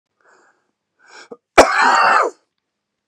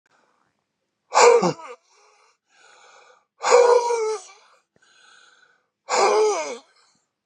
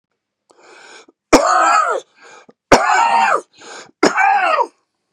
cough_length: 3.1 s
cough_amplitude: 32768
cough_signal_mean_std_ratio: 0.38
exhalation_length: 7.3 s
exhalation_amplitude: 31042
exhalation_signal_mean_std_ratio: 0.39
three_cough_length: 5.1 s
three_cough_amplitude: 32768
three_cough_signal_mean_std_ratio: 0.54
survey_phase: beta (2021-08-13 to 2022-03-07)
age: 65+
gender: Male
wearing_mask: 'No'
symptom_none: true
smoker_status: Ex-smoker
respiratory_condition_asthma: false
respiratory_condition_other: false
recruitment_source: REACT
submission_delay: 5 days
covid_test_result: Negative
covid_test_method: RT-qPCR
influenza_a_test_result: Negative
influenza_b_test_result: Negative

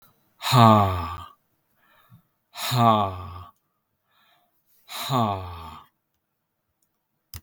exhalation_length: 7.4 s
exhalation_amplitude: 31680
exhalation_signal_mean_std_ratio: 0.35
survey_phase: beta (2021-08-13 to 2022-03-07)
age: 45-64
gender: Male
wearing_mask: 'No'
symptom_runny_or_blocked_nose: true
symptom_change_to_sense_of_smell_or_taste: true
symptom_loss_of_taste: true
symptom_onset: 5 days
smoker_status: Ex-smoker
respiratory_condition_asthma: false
respiratory_condition_other: false
recruitment_source: Test and Trace
submission_delay: 2 days
covid_test_result: Positive
covid_test_method: ePCR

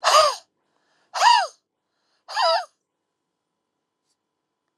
exhalation_length: 4.8 s
exhalation_amplitude: 23112
exhalation_signal_mean_std_ratio: 0.34
survey_phase: alpha (2021-03-01 to 2021-08-12)
age: 45-64
gender: Female
wearing_mask: 'No'
symptom_cough_any: true
symptom_headache: true
symptom_onset: 6 days
smoker_status: Ex-smoker
respiratory_condition_asthma: true
respiratory_condition_other: false
recruitment_source: Test and Trace
submission_delay: 2 days
covid_test_result: Positive
covid_test_method: RT-qPCR
covid_ct_value: 15.0
covid_ct_gene: N gene
covid_ct_mean: 15.0
covid_viral_load: 12000000 copies/ml
covid_viral_load_category: High viral load (>1M copies/ml)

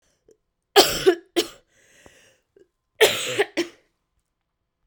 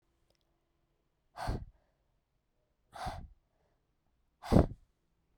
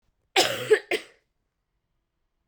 three_cough_length: 4.9 s
three_cough_amplitude: 32767
three_cough_signal_mean_std_ratio: 0.3
exhalation_length: 5.4 s
exhalation_amplitude: 10387
exhalation_signal_mean_std_ratio: 0.21
cough_length: 2.5 s
cough_amplitude: 16258
cough_signal_mean_std_ratio: 0.3
survey_phase: beta (2021-08-13 to 2022-03-07)
age: 18-44
gender: Female
wearing_mask: 'No'
symptom_cough_any: true
symptom_new_continuous_cough: true
symptom_runny_or_blocked_nose: true
symptom_shortness_of_breath: true
symptom_sore_throat: true
symptom_fatigue: true
symptom_fever_high_temperature: true
symptom_headache: true
symptom_other: true
symptom_onset: 4 days
smoker_status: Ex-smoker
respiratory_condition_asthma: false
respiratory_condition_other: false
recruitment_source: Test and Trace
submission_delay: 2 days
covid_test_result: Positive
covid_test_method: RT-qPCR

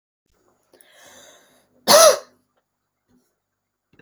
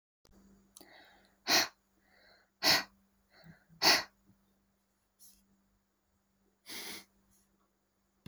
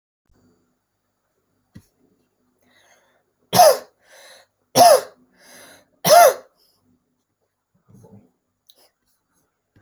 cough_length: 4.0 s
cough_amplitude: 32768
cough_signal_mean_std_ratio: 0.22
exhalation_length: 8.3 s
exhalation_amplitude: 7585
exhalation_signal_mean_std_ratio: 0.24
three_cough_length: 9.8 s
three_cough_amplitude: 30678
three_cough_signal_mean_std_ratio: 0.23
survey_phase: beta (2021-08-13 to 2022-03-07)
age: 18-44
gender: Female
wearing_mask: 'No'
symptom_fatigue: true
smoker_status: Never smoked
respiratory_condition_asthma: false
respiratory_condition_other: false
recruitment_source: REACT
submission_delay: 1 day
covid_test_result: Negative
covid_test_method: RT-qPCR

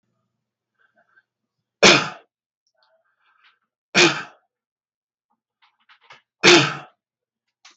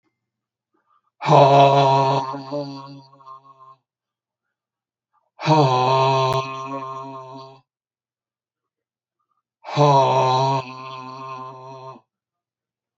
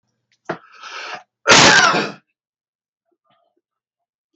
three_cough_length: 7.8 s
three_cough_amplitude: 32768
three_cough_signal_mean_std_ratio: 0.24
exhalation_length: 13.0 s
exhalation_amplitude: 32768
exhalation_signal_mean_std_ratio: 0.44
cough_length: 4.4 s
cough_amplitude: 32768
cough_signal_mean_std_ratio: 0.33
survey_phase: beta (2021-08-13 to 2022-03-07)
age: 65+
gender: Male
wearing_mask: 'No'
symptom_none: true
smoker_status: Never smoked
respiratory_condition_asthma: false
respiratory_condition_other: true
recruitment_source: REACT
submission_delay: 1 day
covid_test_result: Negative
covid_test_method: RT-qPCR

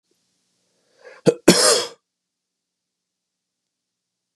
cough_length: 4.4 s
cough_amplitude: 32768
cough_signal_mean_std_ratio: 0.23
survey_phase: beta (2021-08-13 to 2022-03-07)
age: 18-44
gender: Male
wearing_mask: 'No'
symptom_runny_or_blocked_nose: true
symptom_change_to_sense_of_smell_or_taste: true
symptom_loss_of_taste: true
smoker_status: Never smoked
respiratory_condition_asthma: false
respiratory_condition_other: false
recruitment_source: Test and Trace
submission_delay: 1 day
covid_test_result: Positive
covid_test_method: RT-qPCR
covid_ct_value: 26.1
covid_ct_gene: ORF1ab gene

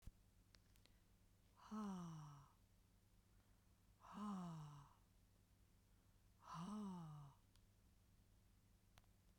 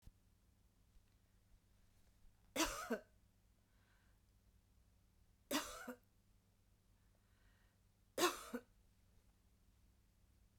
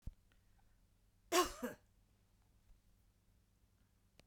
exhalation_length: 9.4 s
exhalation_amplitude: 267
exhalation_signal_mean_std_ratio: 0.57
three_cough_length: 10.6 s
three_cough_amplitude: 2758
three_cough_signal_mean_std_ratio: 0.27
cough_length: 4.3 s
cough_amplitude: 3456
cough_signal_mean_std_ratio: 0.23
survey_phase: beta (2021-08-13 to 2022-03-07)
age: 45-64
gender: Female
wearing_mask: 'No'
symptom_none: true
smoker_status: Never smoked
respiratory_condition_asthma: false
respiratory_condition_other: false
recruitment_source: REACT
submission_delay: 2 days
covid_test_result: Negative
covid_test_method: RT-qPCR
influenza_a_test_result: Negative
influenza_b_test_result: Negative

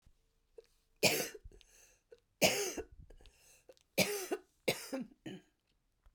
three_cough_length: 6.1 s
three_cough_amplitude: 6616
three_cough_signal_mean_std_ratio: 0.35
survey_phase: beta (2021-08-13 to 2022-03-07)
age: 45-64
gender: Female
wearing_mask: 'No'
symptom_cough_any: true
symptom_runny_or_blocked_nose: true
symptom_sore_throat: true
symptom_fatigue: true
symptom_headache: true
smoker_status: Ex-smoker
respiratory_condition_asthma: true
respiratory_condition_other: false
recruitment_source: Test and Trace
submission_delay: 1 day
covid_test_result: Positive
covid_test_method: LFT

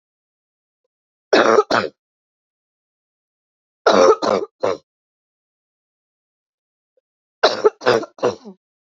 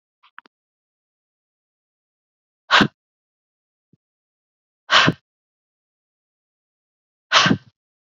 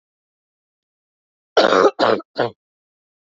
three_cough_length: 9.0 s
three_cough_amplitude: 30858
three_cough_signal_mean_std_ratio: 0.31
exhalation_length: 8.2 s
exhalation_amplitude: 32767
exhalation_signal_mean_std_ratio: 0.21
cough_length: 3.2 s
cough_amplitude: 28238
cough_signal_mean_std_ratio: 0.33
survey_phase: beta (2021-08-13 to 2022-03-07)
age: 18-44
gender: Male
wearing_mask: 'No'
symptom_cough_any: true
symptom_new_continuous_cough: true
symptom_runny_or_blocked_nose: true
symptom_shortness_of_breath: true
symptom_sore_throat: true
symptom_fatigue: true
symptom_fever_high_temperature: true
symptom_headache: true
symptom_change_to_sense_of_smell_or_taste: true
symptom_loss_of_taste: true
smoker_status: Never smoked
respiratory_condition_asthma: true
respiratory_condition_other: false
recruitment_source: Test and Trace
submission_delay: 0 days
covid_test_method: RT-qPCR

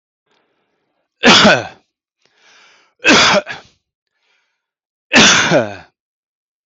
three_cough_length: 6.7 s
three_cough_amplitude: 32768
three_cough_signal_mean_std_ratio: 0.38
survey_phase: beta (2021-08-13 to 2022-03-07)
age: 45-64
gender: Male
wearing_mask: 'No'
symptom_none: true
smoker_status: Ex-smoker
respiratory_condition_asthma: false
respiratory_condition_other: false
recruitment_source: REACT
submission_delay: 1 day
covid_test_result: Negative
covid_test_method: RT-qPCR
influenza_a_test_result: Negative
influenza_b_test_result: Negative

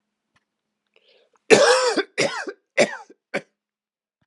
cough_length: 4.3 s
cough_amplitude: 32767
cough_signal_mean_std_ratio: 0.35
survey_phase: beta (2021-08-13 to 2022-03-07)
age: 65+
gender: Male
wearing_mask: 'No'
symptom_cough_any: true
symptom_runny_or_blocked_nose: true
symptom_sore_throat: true
symptom_fatigue: true
symptom_headache: true
symptom_onset: 4 days
smoker_status: Never smoked
respiratory_condition_asthma: false
respiratory_condition_other: false
recruitment_source: Test and Trace
submission_delay: 1 day
covid_test_result: Positive
covid_test_method: RT-qPCR
covid_ct_value: 13.5
covid_ct_gene: ORF1ab gene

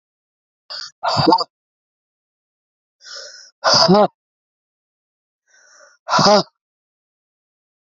exhalation_length: 7.9 s
exhalation_amplitude: 32767
exhalation_signal_mean_std_ratio: 0.31
survey_phase: beta (2021-08-13 to 2022-03-07)
age: 18-44
gender: Female
wearing_mask: 'No'
symptom_cough_any: true
symptom_runny_or_blocked_nose: true
symptom_shortness_of_breath: true
symptom_sore_throat: true
symptom_fatigue: true
symptom_onset: 6 days
smoker_status: Ex-smoker
respiratory_condition_asthma: false
respiratory_condition_other: true
recruitment_source: REACT
submission_delay: 1 day
covid_test_result: Negative
covid_test_method: RT-qPCR
influenza_a_test_result: Negative
influenza_b_test_result: Negative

